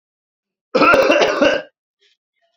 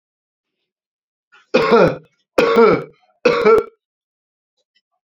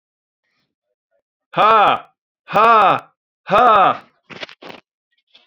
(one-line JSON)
{"cough_length": "2.6 s", "cough_amplitude": 32322, "cough_signal_mean_std_ratio": 0.49, "three_cough_length": "5.0 s", "three_cough_amplitude": 31602, "three_cough_signal_mean_std_ratio": 0.4, "exhalation_length": "5.5 s", "exhalation_amplitude": 29872, "exhalation_signal_mean_std_ratio": 0.41, "survey_phase": "beta (2021-08-13 to 2022-03-07)", "age": "45-64", "gender": "Male", "wearing_mask": "No", "symptom_none": true, "smoker_status": "Never smoked", "respiratory_condition_asthma": false, "respiratory_condition_other": false, "recruitment_source": "REACT", "submission_delay": "1 day", "covid_test_result": "Negative", "covid_test_method": "RT-qPCR"}